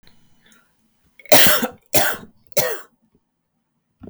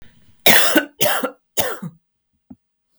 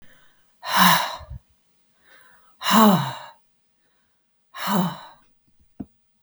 {
  "three_cough_length": "4.1 s",
  "three_cough_amplitude": 32768,
  "three_cough_signal_mean_std_ratio": 0.34,
  "cough_length": "3.0 s",
  "cough_amplitude": 32768,
  "cough_signal_mean_std_ratio": 0.42,
  "exhalation_length": "6.2 s",
  "exhalation_amplitude": 30989,
  "exhalation_signal_mean_std_ratio": 0.36,
  "survey_phase": "beta (2021-08-13 to 2022-03-07)",
  "age": "45-64",
  "gender": "Female",
  "wearing_mask": "No",
  "symptom_none": true,
  "smoker_status": "Never smoked",
  "respiratory_condition_asthma": false,
  "respiratory_condition_other": false,
  "recruitment_source": "REACT",
  "submission_delay": "2 days",
  "covid_test_result": "Negative",
  "covid_test_method": "RT-qPCR"
}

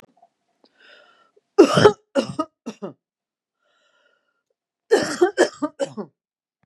{
  "three_cough_length": "6.7 s",
  "three_cough_amplitude": 32767,
  "three_cough_signal_mean_std_ratio": 0.28,
  "survey_phase": "beta (2021-08-13 to 2022-03-07)",
  "age": "45-64",
  "gender": "Female",
  "wearing_mask": "No",
  "symptom_none": true,
  "smoker_status": "Ex-smoker",
  "respiratory_condition_asthma": false,
  "respiratory_condition_other": false,
  "recruitment_source": "REACT",
  "submission_delay": "1 day",
  "covid_test_result": "Negative",
  "covid_test_method": "RT-qPCR",
  "influenza_a_test_result": "Unknown/Void",
  "influenza_b_test_result": "Unknown/Void"
}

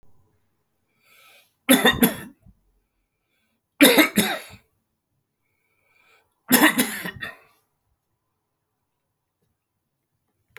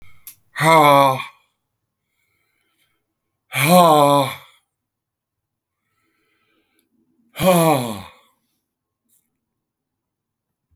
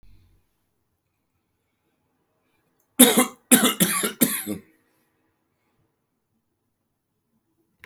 {
  "three_cough_length": "10.6 s",
  "three_cough_amplitude": 31160,
  "three_cough_signal_mean_std_ratio": 0.27,
  "exhalation_length": "10.8 s",
  "exhalation_amplitude": 31244,
  "exhalation_signal_mean_std_ratio": 0.33,
  "cough_length": "7.9 s",
  "cough_amplitude": 32768,
  "cough_signal_mean_std_ratio": 0.25,
  "survey_phase": "beta (2021-08-13 to 2022-03-07)",
  "age": "65+",
  "gender": "Male",
  "wearing_mask": "No",
  "symptom_cough_any": true,
  "symptom_sore_throat": true,
  "symptom_headache": true,
  "smoker_status": "Never smoked",
  "respiratory_condition_asthma": false,
  "respiratory_condition_other": false,
  "recruitment_source": "Test and Trace",
  "submission_delay": "1 day",
  "covid_test_result": "Positive",
  "covid_test_method": "RT-qPCR",
  "covid_ct_value": 28.9,
  "covid_ct_gene": "ORF1ab gene"
}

